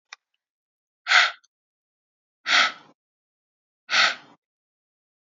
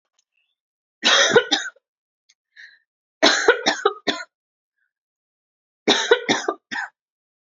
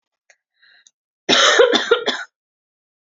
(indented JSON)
{
  "exhalation_length": "5.3 s",
  "exhalation_amplitude": 25915,
  "exhalation_signal_mean_std_ratio": 0.28,
  "three_cough_length": "7.6 s",
  "three_cough_amplitude": 29137,
  "three_cough_signal_mean_std_ratio": 0.36,
  "cough_length": "3.2 s",
  "cough_amplitude": 28046,
  "cough_signal_mean_std_ratio": 0.4,
  "survey_phase": "beta (2021-08-13 to 2022-03-07)",
  "age": "18-44",
  "gender": "Female",
  "wearing_mask": "No",
  "symptom_cough_any": true,
  "symptom_runny_or_blocked_nose": true,
  "symptom_fatigue": true,
  "symptom_headache": true,
  "symptom_onset": "4 days",
  "smoker_status": "Never smoked",
  "respiratory_condition_asthma": false,
  "respiratory_condition_other": false,
  "recruitment_source": "Test and Trace",
  "submission_delay": "2 days",
  "covid_test_result": "Positive",
  "covid_test_method": "RT-qPCR",
  "covid_ct_value": 19.6,
  "covid_ct_gene": "ORF1ab gene",
  "covid_ct_mean": 19.9,
  "covid_viral_load": "290000 copies/ml",
  "covid_viral_load_category": "Low viral load (10K-1M copies/ml)"
}